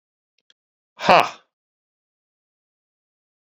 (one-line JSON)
{"exhalation_length": "3.5 s", "exhalation_amplitude": 27538, "exhalation_signal_mean_std_ratio": 0.17, "survey_phase": "beta (2021-08-13 to 2022-03-07)", "age": "45-64", "gender": "Male", "wearing_mask": "No", "symptom_fatigue": true, "symptom_headache": true, "symptom_onset": "3 days", "smoker_status": "Never smoked", "respiratory_condition_asthma": false, "respiratory_condition_other": false, "recruitment_source": "Test and Trace", "submission_delay": "2 days", "covid_test_result": "Positive", "covid_test_method": "LAMP"}